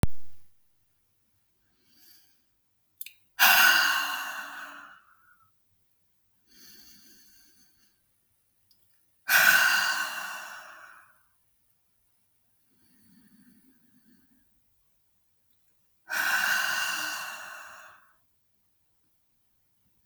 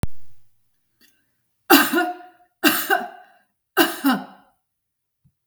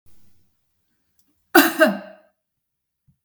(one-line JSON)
{"exhalation_length": "20.1 s", "exhalation_amplitude": 17174, "exhalation_signal_mean_std_ratio": 0.34, "three_cough_length": "5.5 s", "three_cough_amplitude": 32768, "three_cough_signal_mean_std_ratio": 0.4, "cough_length": "3.2 s", "cough_amplitude": 32768, "cough_signal_mean_std_ratio": 0.25, "survey_phase": "beta (2021-08-13 to 2022-03-07)", "age": "45-64", "gender": "Female", "wearing_mask": "No", "symptom_none": true, "smoker_status": "Never smoked", "respiratory_condition_asthma": false, "respiratory_condition_other": false, "recruitment_source": "REACT", "submission_delay": "2 days", "covid_test_result": "Negative", "covid_test_method": "RT-qPCR"}